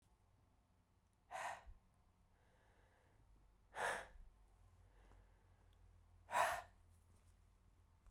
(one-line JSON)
{"exhalation_length": "8.1 s", "exhalation_amplitude": 2762, "exhalation_signal_mean_std_ratio": 0.32, "survey_phase": "beta (2021-08-13 to 2022-03-07)", "age": "45-64", "gender": "Female", "wearing_mask": "No", "symptom_fatigue": true, "smoker_status": "Never smoked", "respiratory_condition_asthma": true, "respiratory_condition_other": false, "recruitment_source": "REACT", "submission_delay": "3 days", "covid_test_result": "Negative", "covid_test_method": "RT-qPCR"}